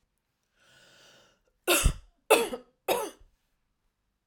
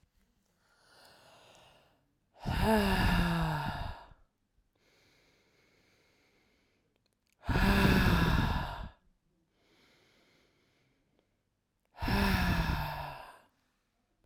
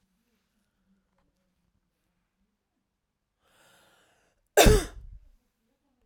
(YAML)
three_cough_length: 4.3 s
three_cough_amplitude: 16193
three_cough_signal_mean_std_ratio: 0.3
exhalation_length: 14.3 s
exhalation_amplitude: 6979
exhalation_signal_mean_std_ratio: 0.44
cough_length: 6.1 s
cough_amplitude: 21601
cough_signal_mean_std_ratio: 0.17
survey_phase: beta (2021-08-13 to 2022-03-07)
age: 45-64
gender: Female
wearing_mask: 'No'
symptom_headache: true
smoker_status: Ex-smoker
respiratory_condition_asthma: false
respiratory_condition_other: false
recruitment_source: REACT
submission_delay: 2 days
covid_test_result: Negative
covid_test_method: RT-qPCR